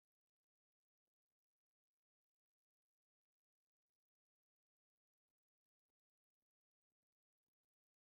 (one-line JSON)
{"three_cough_length": "8.0 s", "three_cough_amplitude": 2, "three_cough_signal_mean_std_ratio": 0.08, "survey_phase": "beta (2021-08-13 to 2022-03-07)", "age": "65+", "gender": "Female", "wearing_mask": "No", "symptom_none": true, "smoker_status": "Ex-smoker", "respiratory_condition_asthma": false, "respiratory_condition_other": false, "recruitment_source": "REACT", "submission_delay": "2 days", "covid_test_result": "Negative", "covid_test_method": "RT-qPCR", "influenza_a_test_result": "Negative", "influenza_b_test_result": "Negative"}